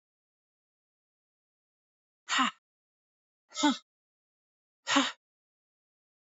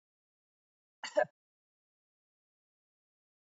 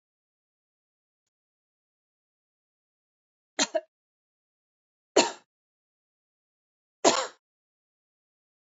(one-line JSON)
{"exhalation_length": "6.3 s", "exhalation_amplitude": 8103, "exhalation_signal_mean_std_ratio": 0.24, "cough_length": "3.6 s", "cough_amplitude": 4181, "cough_signal_mean_std_ratio": 0.13, "three_cough_length": "8.8 s", "three_cough_amplitude": 21460, "three_cough_signal_mean_std_ratio": 0.16, "survey_phase": "beta (2021-08-13 to 2022-03-07)", "age": "45-64", "gender": "Female", "wearing_mask": "No", "symptom_cough_any": true, "symptom_runny_or_blocked_nose": true, "symptom_sore_throat": true, "smoker_status": "Never smoked", "respiratory_condition_asthma": true, "respiratory_condition_other": false, "recruitment_source": "REACT", "submission_delay": "2 days", "covid_test_result": "Negative", "covid_test_method": "RT-qPCR", "influenza_a_test_result": "Unknown/Void", "influenza_b_test_result": "Unknown/Void"}